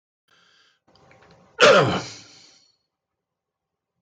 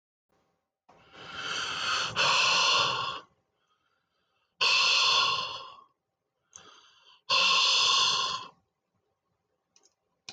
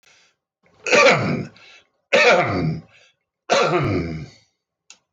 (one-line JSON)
{"cough_length": "4.0 s", "cough_amplitude": 20244, "cough_signal_mean_std_ratio": 0.26, "exhalation_length": "10.3 s", "exhalation_amplitude": 8837, "exhalation_signal_mean_std_ratio": 0.52, "three_cough_length": "5.1 s", "three_cough_amplitude": 18104, "three_cough_signal_mean_std_ratio": 0.51, "survey_phase": "beta (2021-08-13 to 2022-03-07)", "age": "65+", "gender": "Male", "wearing_mask": "No", "symptom_none": true, "smoker_status": "Ex-smoker", "respiratory_condition_asthma": false, "respiratory_condition_other": false, "recruitment_source": "REACT", "submission_delay": "0 days", "covid_test_result": "Negative", "covid_test_method": "RT-qPCR"}